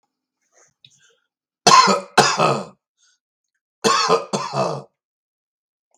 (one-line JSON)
{"cough_length": "6.0 s", "cough_amplitude": 32768, "cough_signal_mean_std_ratio": 0.37, "survey_phase": "beta (2021-08-13 to 2022-03-07)", "age": "65+", "gender": "Male", "wearing_mask": "No", "symptom_none": true, "smoker_status": "Ex-smoker", "respiratory_condition_asthma": false, "respiratory_condition_other": false, "recruitment_source": "REACT", "submission_delay": "3 days", "covid_test_result": "Negative", "covid_test_method": "RT-qPCR", "influenza_a_test_result": "Negative", "influenza_b_test_result": "Negative"}